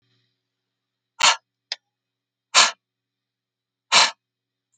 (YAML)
exhalation_length: 4.8 s
exhalation_amplitude: 29905
exhalation_signal_mean_std_ratio: 0.24
survey_phase: alpha (2021-03-01 to 2021-08-12)
age: 45-64
gender: Female
wearing_mask: 'No'
symptom_none: true
smoker_status: Current smoker (11 or more cigarettes per day)
respiratory_condition_asthma: false
respiratory_condition_other: false
recruitment_source: REACT
submission_delay: 2 days
covid_test_result: Negative
covid_test_method: RT-qPCR